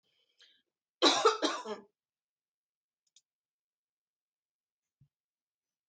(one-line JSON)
{"three_cough_length": "5.9 s", "three_cough_amplitude": 8944, "three_cough_signal_mean_std_ratio": 0.22, "survey_phase": "alpha (2021-03-01 to 2021-08-12)", "age": "45-64", "gender": "Female", "wearing_mask": "No", "symptom_none": true, "smoker_status": "Never smoked", "respiratory_condition_asthma": false, "respiratory_condition_other": false, "recruitment_source": "REACT", "submission_delay": "2 days", "covid_test_result": "Negative", "covid_test_method": "RT-qPCR"}